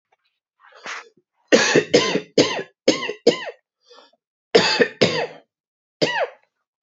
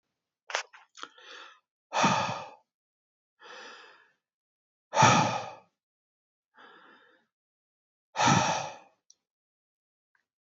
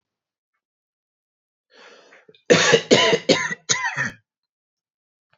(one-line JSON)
{"three_cough_length": "6.8 s", "three_cough_amplitude": 28525, "three_cough_signal_mean_std_ratio": 0.4, "exhalation_length": "10.4 s", "exhalation_amplitude": 13527, "exhalation_signal_mean_std_ratio": 0.31, "cough_length": "5.4 s", "cough_amplitude": 29532, "cough_signal_mean_std_ratio": 0.35, "survey_phase": "beta (2021-08-13 to 2022-03-07)", "age": "18-44", "gender": "Male", "wearing_mask": "No", "symptom_runny_or_blocked_nose": true, "symptom_headache": true, "symptom_onset": "8 days", "smoker_status": "Never smoked", "respiratory_condition_asthma": false, "respiratory_condition_other": false, "recruitment_source": "REACT", "submission_delay": "1 day", "covid_test_result": "Negative", "covid_test_method": "RT-qPCR", "influenza_a_test_result": "Negative", "influenza_b_test_result": "Negative"}